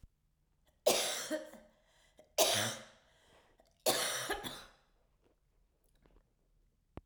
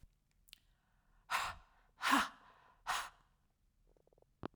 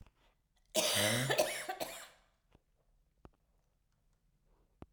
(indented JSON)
{
  "three_cough_length": "7.1 s",
  "three_cough_amplitude": 6097,
  "three_cough_signal_mean_std_ratio": 0.37,
  "exhalation_length": "4.6 s",
  "exhalation_amplitude": 4301,
  "exhalation_signal_mean_std_ratio": 0.31,
  "cough_length": "4.9 s",
  "cough_amplitude": 5303,
  "cough_signal_mean_std_ratio": 0.38,
  "survey_phase": "beta (2021-08-13 to 2022-03-07)",
  "age": "45-64",
  "gender": "Female",
  "wearing_mask": "No",
  "symptom_cough_any": true,
  "symptom_runny_or_blocked_nose": true,
  "symptom_sore_throat": true,
  "smoker_status": "Never smoked",
  "respiratory_condition_asthma": false,
  "respiratory_condition_other": false,
  "recruitment_source": "Test and Trace",
  "submission_delay": "2 days",
  "covid_test_result": "Positive",
  "covid_test_method": "RT-qPCR",
  "covid_ct_value": 31.5,
  "covid_ct_gene": "N gene"
}